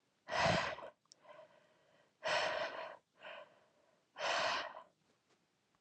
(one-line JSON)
{"exhalation_length": "5.8 s", "exhalation_amplitude": 2877, "exhalation_signal_mean_std_ratio": 0.47, "survey_phase": "alpha (2021-03-01 to 2021-08-12)", "age": "18-44", "gender": "Female", "wearing_mask": "No", "symptom_cough_any": true, "symptom_onset": "6 days", "smoker_status": "Never smoked", "respiratory_condition_asthma": false, "respiratory_condition_other": false, "recruitment_source": "Test and Trace", "submission_delay": "2 days", "covid_test_result": "Positive", "covid_test_method": "RT-qPCR", "covid_ct_value": 12.7, "covid_ct_gene": "N gene", "covid_ct_mean": 13.4, "covid_viral_load": "41000000 copies/ml", "covid_viral_load_category": "High viral load (>1M copies/ml)"}